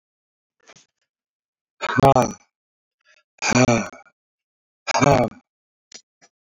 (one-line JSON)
{"exhalation_length": "6.6 s", "exhalation_amplitude": 26764, "exhalation_signal_mean_std_ratio": 0.32, "survey_phase": "beta (2021-08-13 to 2022-03-07)", "age": "65+", "gender": "Male", "wearing_mask": "No", "symptom_none": true, "smoker_status": "Never smoked", "respiratory_condition_asthma": true, "respiratory_condition_other": false, "recruitment_source": "REACT", "submission_delay": "3 days", "covid_test_result": "Negative", "covid_test_method": "RT-qPCR", "influenza_a_test_result": "Negative", "influenza_b_test_result": "Negative"}